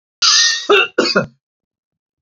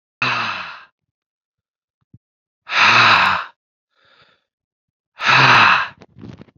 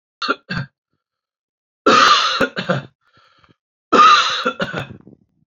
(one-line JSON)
{"cough_length": "2.2 s", "cough_amplitude": 31543, "cough_signal_mean_std_ratio": 0.52, "exhalation_length": "6.6 s", "exhalation_amplitude": 29354, "exhalation_signal_mean_std_ratio": 0.42, "three_cough_length": "5.5 s", "three_cough_amplitude": 29424, "three_cough_signal_mean_std_ratio": 0.44, "survey_phase": "beta (2021-08-13 to 2022-03-07)", "age": "45-64", "gender": "Male", "wearing_mask": "No", "symptom_none": true, "smoker_status": "Ex-smoker", "respiratory_condition_asthma": false, "respiratory_condition_other": false, "recruitment_source": "REACT", "submission_delay": "1 day", "covid_test_result": "Negative", "covid_test_method": "RT-qPCR", "influenza_a_test_result": "Negative", "influenza_b_test_result": "Negative"}